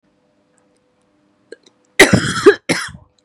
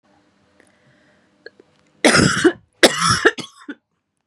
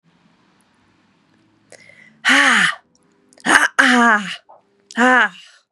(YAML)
cough_length: 3.2 s
cough_amplitude: 32768
cough_signal_mean_std_ratio: 0.3
three_cough_length: 4.3 s
three_cough_amplitude: 32768
three_cough_signal_mean_std_ratio: 0.35
exhalation_length: 5.7 s
exhalation_amplitude: 32768
exhalation_signal_mean_std_ratio: 0.43
survey_phase: beta (2021-08-13 to 2022-03-07)
age: 18-44
gender: Female
wearing_mask: 'No'
symptom_cough_any: true
symptom_new_continuous_cough: true
symptom_runny_or_blocked_nose: true
symptom_shortness_of_breath: true
symptom_sore_throat: true
symptom_fatigue: true
symptom_fever_high_temperature: true
symptom_headache: true
symptom_onset: 3 days
smoker_status: Ex-smoker
respiratory_condition_asthma: true
respiratory_condition_other: false
recruitment_source: Test and Trace
submission_delay: 2 days
covid_test_result: Positive
covid_test_method: RT-qPCR
covid_ct_value: 21.7
covid_ct_gene: ORF1ab gene
covid_ct_mean: 22.1
covid_viral_load: 57000 copies/ml
covid_viral_load_category: Low viral load (10K-1M copies/ml)